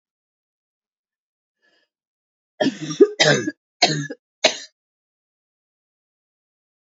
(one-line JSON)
{"three_cough_length": "6.9 s", "three_cough_amplitude": 32645, "three_cough_signal_mean_std_ratio": 0.25, "survey_phase": "beta (2021-08-13 to 2022-03-07)", "age": "18-44", "gender": "Female", "wearing_mask": "No", "symptom_cough_any": true, "symptom_runny_or_blocked_nose": true, "symptom_sore_throat": true, "symptom_onset": "2 days", "smoker_status": "Never smoked", "respiratory_condition_asthma": false, "respiratory_condition_other": false, "recruitment_source": "Test and Trace", "submission_delay": "1 day", "covid_test_result": "Positive", "covid_test_method": "ePCR"}